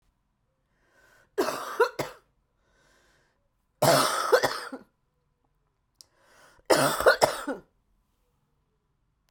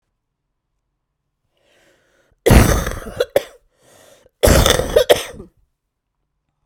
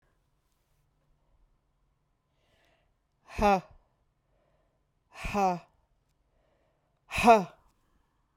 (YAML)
three_cough_length: 9.3 s
three_cough_amplitude: 23473
three_cough_signal_mean_std_ratio: 0.33
cough_length: 6.7 s
cough_amplitude: 32768
cough_signal_mean_std_ratio: 0.33
exhalation_length: 8.4 s
exhalation_amplitude: 14344
exhalation_signal_mean_std_ratio: 0.24
survey_phase: beta (2021-08-13 to 2022-03-07)
age: 45-64
gender: Female
wearing_mask: 'No'
symptom_cough_any: true
symptom_sore_throat: true
symptom_headache: true
symptom_change_to_sense_of_smell_or_taste: true
symptom_onset: 4 days
smoker_status: Ex-smoker
respiratory_condition_asthma: false
respiratory_condition_other: false
recruitment_source: Test and Trace
submission_delay: 1 day
covid_test_result: Positive
covid_test_method: RT-qPCR
covid_ct_value: 14.6
covid_ct_gene: ORF1ab gene
covid_ct_mean: 14.8
covid_viral_load: 14000000 copies/ml
covid_viral_load_category: High viral load (>1M copies/ml)